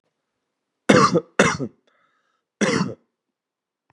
{"three_cough_length": "3.9 s", "three_cough_amplitude": 32767, "three_cough_signal_mean_std_ratio": 0.34, "survey_phase": "beta (2021-08-13 to 2022-03-07)", "age": "18-44", "gender": "Male", "wearing_mask": "No", "symptom_cough_any": true, "symptom_new_continuous_cough": true, "symptom_sore_throat": true, "symptom_onset": "3 days", "smoker_status": "Never smoked", "respiratory_condition_asthma": false, "respiratory_condition_other": false, "recruitment_source": "Test and Trace", "submission_delay": "2 days", "covid_test_result": "Positive", "covid_test_method": "RT-qPCR", "covid_ct_value": 18.2, "covid_ct_gene": "N gene", "covid_ct_mean": 19.1, "covid_viral_load": "560000 copies/ml", "covid_viral_load_category": "Low viral load (10K-1M copies/ml)"}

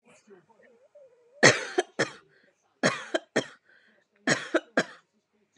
{"three_cough_length": "5.6 s", "three_cough_amplitude": 26576, "three_cough_signal_mean_std_ratio": 0.29, "survey_phase": "beta (2021-08-13 to 2022-03-07)", "age": "18-44", "gender": "Female", "wearing_mask": "No", "symptom_none": true, "smoker_status": "Ex-smoker", "respiratory_condition_asthma": false, "respiratory_condition_other": false, "recruitment_source": "REACT", "submission_delay": "1 day", "covid_test_result": "Negative", "covid_test_method": "RT-qPCR", "influenza_a_test_result": "Negative", "influenza_b_test_result": "Negative"}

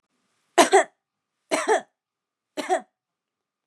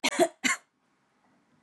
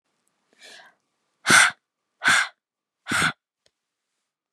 {"three_cough_length": "3.7 s", "three_cough_amplitude": 29718, "three_cough_signal_mean_std_ratio": 0.3, "cough_length": "1.6 s", "cough_amplitude": 10674, "cough_signal_mean_std_ratio": 0.34, "exhalation_length": "4.5 s", "exhalation_amplitude": 28247, "exhalation_signal_mean_std_ratio": 0.3, "survey_phase": "beta (2021-08-13 to 2022-03-07)", "age": "18-44", "gender": "Female", "wearing_mask": "No", "symptom_none": true, "smoker_status": "Never smoked", "respiratory_condition_asthma": false, "respiratory_condition_other": false, "recruitment_source": "REACT", "submission_delay": "4 days", "covid_test_result": "Negative", "covid_test_method": "RT-qPCR"}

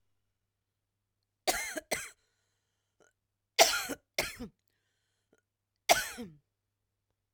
{"cough_length": "7.3 s", "cough_amplitude": 17371, "cough_signal_mean_std_ratio": 0.24, "survey_phase": "alpha (2021-03-01 to 2021-08-12)", "age": "45-64", "gender": "Female", "wearing_mask": "No", "symptom_fatigue": true, "symptom_onset": "12 days", "smoker_status": "Never smoked", "respiratory_condition_asthma": true, "respiratory_condition_other": false, "recruitment_source": "REACT", "submission_delay": "2 days", "covid_test_result": "Negative", "covid_test_method": "RT-qPCR"}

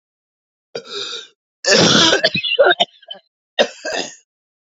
{"three_cough_length": "4.8 s", "three_cough_amplitude": 31820, "three_cough_signal_mean_std_ratio": 0.45, "survey_phase": "alpha (2021-03-01 to 2021-08-12)", "age": "45-64", "gender": "Male", "wearing_mask": "No", "symptom_cough_any": true, "symptom_new_continuous_cough": true, "symptom_shortness_of_breath": true, "symptom_fatigue": true, "symptom_fever_high_temperature": true, "symptom_headache": true, "symptom_onset": "3 days", "smoker_status": "Ex-smoker", "respiratory_condition_asthma": false, "respiratory_condition_other": false, "recruitment_source": "Test and Trace", "submission_delay": "1 day", "covid_test_result": "Positive", "covid_test_method": "RT-qPCR", "covid_ct_value": 15.8, "covid_ct_gene": "N gene", "covid_ct_mean": 16.0, "covid_viral_load": "5500000 copies/ml", "covid_viral_load_category": "High viral load (>1M copies/ml)"}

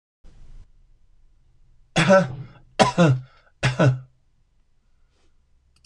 {"three_cough_length": "5.9 s", "three_cough_amplitude": 26027, "three_cough_signal_mean_std_ratio": 0.35, "survey_phase": "beta (2021-08-13 to 2022-03-07)", "age": "65+", "gender": "Male", "wearing_mask": "No", "symptom_cough_any": true, "smoker_status": "Never smoked", "respiratory_condition_asthma": false, "respiratory_condition_other": false, "recruitment_source": "REACT", "submission_delay": "1 day", "covid_test_result": "Negative", "covid_test_method": "RT-qPCR", "influenza_a_test_result": "Unknown/Void", "influenza_b_test_result": "Unknown/Void"}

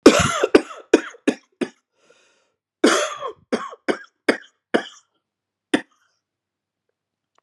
{"cough_length": "7.4 s", "cough_amplitude": 32768, "cough_signal_mean_std_ratio": 0.29, "survey_phase": "beta (2021-08-13 to 2022-03-07)", "age": "65+", "gender": "Male", "wearing_mask": "No", "symptom_new_continuous_cough": true, "symptom_runny_or_blocked_nose": true, "symptom_shortness_of_breath": true, "symptom_fatigue": true, "symptom_fever_high_temperature": true, "symptom_headache": true, "symptom_onset": "5 days", "smoker_status": "Never smoked", "respiratory_condition_asthma": false, "respiratory_condition_other": false, "recruitment_source": "Test and Trace", "submission_delay": "2 days", "covid_test_result": "Positive", "covid_test_method": "RT-qPCR"}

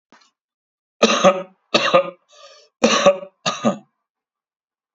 {"three_cough_length": "4.9 s", "three_cough_amplitude": 29597, "three_cough_signal_mean_std_ratio": 0.38, "survey_phase": "beta (2021-08-13 to 2022-03-07)", "age": "45-64", "gender": "Male", "wearing_mask": "No", "symptom_none": true, "smoker_status": "Ex-smoker", "respiratory_condition_asthma": false, "respiratory_condition_other": false, "recruitment_source": "REACT", "submission_delay": "1 day", "covid_test_result": "Negative", "covid_test_method": "RT-qPCR", "influenza_a_test_result": "Negative", "influenza_b_test_result": "Negative"}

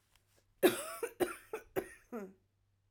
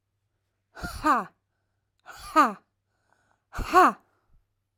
{"three_cough_length": "2.9 s", "three_cough_amplitude": 7065, "three_cough_signal_mean_std_ratio": 0.33, "exhalation_length": "4.8 s", "exhalation_amplitude": 18148, "exhalation_signal_mean_std_ratio": 0.3, "survey_phase": "alpha (2021-03-01 to 2021-08-12)", "age": "18-44", "gender": "Female", "wearing_mask": "No", "symptom_cough_any": true, "symptom_shortness_of_breath": true, "symptom_onset": "12 days", "smoker_status": "Ex-smoker", "respiratory_condition_asthma": true, "respiratory_condition_other": false, "recruitment_source": "REACT", "submission_delay": "1 day", "covid_test_result": "Negative", "covid_test_method": "RT-qPCR"}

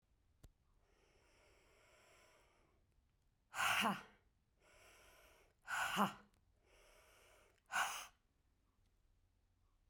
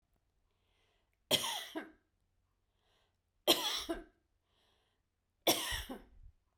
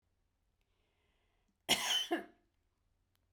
{"exhalation_length": "9.9 s", "exhalation_amplitude": 2101, "exhalation_signal_mean_std_ratio": 0.3, "three_cough_length": "6.6 s", "three_cough_amplitude": 7498, "three_cough_signal_mean_std_ratio": 0.31, "cough_length": "3.3 s", "cough_amplitude": 4720, "cough_signal_mean_std_ratio": 0.3, "survey_phase": "beta (2021-08-13 to 2022-03-07)", "age": "45-64", "gender": "Female", "wearing_mask": "No", "symptom_cough_any": true, "symptom_runny_or_blocked_nose": true, "symptom_shortness_of_breath": true, "symptom_sore_throat": true, "symptom_fatigue": true, "symptom_change_to_sense_of_smell_or_taste": true, "symptom_loss_of_taste": true, "symptom_onset": "2 days", "smoker_status": "Never smoked", "respiratory_condition_asthma": false, "respiratory_condition_other": false, "recruitment_source": "Test and Trace", "submission_delay": "1 day", "covid_test_result": "Positive", "covid_test_method": "RT-qPCR", "covid_ct_value": 19.1, "covid_ct_gene": "ORF1ab gene", "covid_ct_mean": 19.6, "covid_viral_load": "370000 copies/ml", "covid_viral_load_category": "Low viral load (10K-1M copies/ml)"}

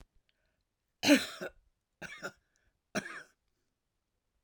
{"three_cough_length": "4.4 s", "three_cough_amplitude": 9227, "three_cough_signal_mean_std_ratio": 0.22, "survey_phase": "alpha (2021-03-01 to 2021-08-12)", "age": "65+", "gender": "Female", "wearing_mask": "No", "symptom_none": true, "symptom_onset": "12 days", "smoker_status": "Never smoked", "respiratory_condition_asthma": false, "respiratory_condition_other": false, "recruitment_source": "REACT", "submission_delay": "1 day", "covid_test_result": "Negative", "covid_test_method": "RT-qPCR"}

